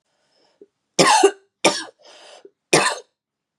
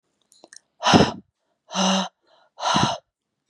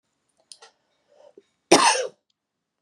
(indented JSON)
{
  "three_cough_length": "3.6 s",
  "three_cough_amplitude": 32768,
  "three_cough_signal_mean_std_ratio": 0.35,
  "exhalation_length": "3.5 s",
  "exhalation_amplitude": 28554,
  "exhalation_signal_mean_std_ratio": 0.4,
  "cough_length": "2.8 s",
  "cough_amplitude": 32767,
  "cough_signal_mean_std_ratio": 0.26,
  "survey_phase": "beta (2021-08-13 to 2022-03-07)",
  "age": "18-44",
  "gender": "Female",
  "wearing_mask": "No",
  "symptom_cough_any": true,
  "symptom_runny_or_blocked_nose": true,
  "symptom_shortness_of_breath": true,
  "symptom_sore_throat": true,
  "symptom_fatigue": true,
  "symptom_headache": true,
  "symptom_onset": "3 days",
  "smoker_status": "Ex-smoker",
  "respiratory_condition_asthma": false,
  "respiratory_condition_other": false,
  "recruitment_source": "Test and Trace",
  "submission_delay": "2 days",
  "covid_test_result": "Positive",
  "covid_test_method": "RT-qPCR",
  "covid_ct_value": 32.3,
  "covid_ct_gene": "ORF1ab gene",
  "covid_ct_mean": 32.6,
  "covid_viral_load": "21 copies/ml",
  "covid_viral_load_category": "Minimal viral load (< 10K copies/ml)"
}